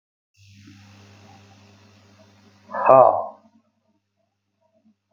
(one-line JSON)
{"exhalation_length": "5.1 s", "exhalation_amplitude": 32766, "exhalation_signal_mean_std_ratio": 0.23, "survey_phase": "beta (2021-08-13 to 2022-03-07)", "age": "45-64", "gender": "Male", "wearing_mask": "No", "symptom_none": true, "smoker_status": "Ex-smoker", "respiratory_condition_asthma": false, "respiratory_condition_other": false, "recruitment_source": "REACT", "submission_delay": "8 days", "covid_test_result": "Negative", "covid_test_method": "RT-qPCR"}